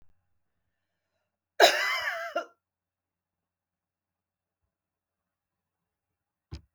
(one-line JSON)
{"cough_length": "6.7 s", "cough_amplitude": 18398, "cough_signal_mean_std_ratio": 0.21, "survey_phase": "beta (2021-08-13 to 2022-03-07)", "age": "45-64", "gender": "Female", "wearing_mask": "No", "symptom_none": true, "symptom_onset": "6 days", "smoker_status": "Never smoked", "respiratory_condition_asthma": false, "respiratory_condition_other": false, "recruitment_source": "REACT", "submission_delay": "1 day", "covid_test_result": "Negative", "covid_test_method": "RT-qPCR", "influenza_a_test_result": "Negative", "influenza_b_test_result": "Negative"}